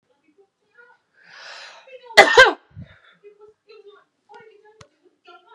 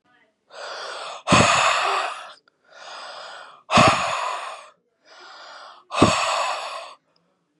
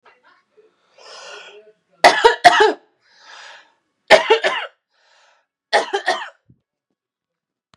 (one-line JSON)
{"cough_length": "5.5 s", "cough_amplitude": 32768, "cough_signal_mean_std_ratio": 0.2, "exhalation_length": "7.6 s", "exhalation_amplitude": 29577, "exhalation_signal_mean_std_ratio": 0.49, "three_cough_length": "7.8 s", "three_cough_amplitude": 32768, "three_cough_signal_mean_std_ratio": 0.3, "survey_phase": "beta (2021-08-13 to 2022-03-07)", "age": "18-44", "gender": "Female", "wearing_mask": "No", "symptom_headache": true, "smoker_status": "Current smoker (e-cigarettes or vapes only)", "respiratory_condition_asthma": true, "respiratory_condition_other": false, "recruitment_source": "REACT", "submission_delay": "2 days", "covid_test_result": "Negative", "covid_test_method": "RT-qPCR", "influenza_a_test_result": "Negative", "influenza_b_test_result": "Negative"}